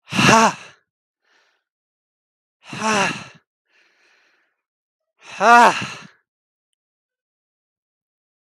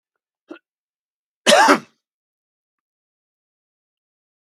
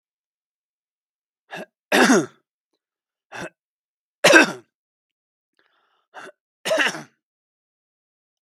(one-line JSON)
{"exhalation_length": "8.5 s", "exhalation_amplitude": 32768, "exhalation_signal_mean_std_ratio": 0.27, "cough_length": "4.4 s", "cough_amplitude": 32768, "cough_signal_mean_std_ratio": 0.22, "three_cough_length": "8.4 s", "three_cough_amplitude": 32768, "three_cough_signal_mean_std_ratio": 0.25, "survey_phase": "beta (2021-08-13 to 2022-03-07)", "age": "45-64", "gender": "Male", "wearing_mask": "No", "symptom_cough_any": true, "smoker_status": "Never smoked", "respiratory_condition_asthma": false, "respiratory_condition_other": false, "recruitment_source": "REACT", "submission_delay": "1 day", "covid_test_result": "Negative", "covid_test_method": "RT-qPCR"}